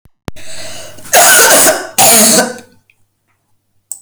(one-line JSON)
{"cough_length": "4.0 s", "cough_amplitude": 32768, "cough_signal_mean_std_ratio": 0.58, "survey_phase": "alpha (2021-03-01 to 2021-08-12)", "age": "65+", "gender": "Female", "wearing_mask": "No", "symptom_none": true, "smoker_status": "Never smoked", "respiratory_condition_asthma": false, "respiratory_condition_other": false, "recruitment_source": "REACT", "submission_delay": "2 days", "covid_test_result": "Negative", "covid_test_method": "RT-qPCR"}